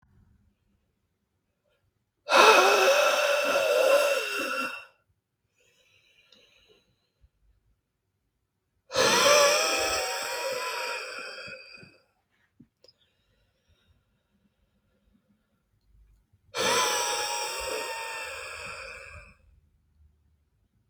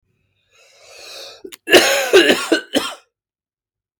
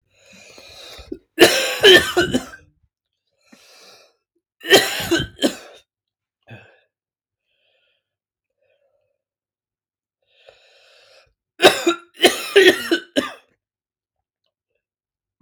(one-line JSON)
{"exhalation_length": "20.9 s", "exhalation_amplitude": 18057, "exhalation_signal_mean_std_ratio": 0.43, "cough_length": "4.0 s", "cough_amplitude": 32768, "cough_signal_mean_std_ratio": 0.38, "three_cough_length": "15.4 s", "three_cough_amplitude": 32768, "three_cough_signal_mean_std_ratio": 0.28, "survey_phase": "beta (2021-08-13 to 2022-03-07)", "age": "18-44", "gender": "Male", "wearing_mask": "No", "symptom_cough_any": true, "symptom_runny_or_blocked_nose": true, "symptom_fever_high_temperature": true, "symptom_headache": true, "symptom_onset": "3 days", "smoker_status": "Never smoked", "respiratory_condition_asthma": false, "respiratory_condition_other": false, "recruitment_source": "Test and Trace", "submission_delay": "2 days", "covid_test_result": "Positive", "covid_test_method": "RT-qPCR"}